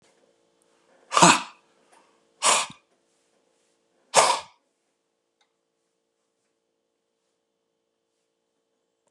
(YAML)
exhalation_length: 9.1 s
exhalation_amplitude: 32174
exhalation_signal_mean_std_ratio: 0.21
survey_phase: beta (2021-08-13 to 2022-03-07)
age: 45-64
gender: Male
wearing_mask: 'No'
symptom_cough_any: true
symptom_runny_or_blocked_nose: true
symptom_sore_throat: true
symptom_diarrhoea: true
symptom_fatigue: true
symptom_fever_high_temperature: true
symptom_other: true
smoker_status: Ex-smoker
respiratory_condition_asthma: false
respiratory_condition_other: false
recruitment_source: Test and Trace
submission_delay: -1 day
covid_test_result: Positive
covid_test_method: LFT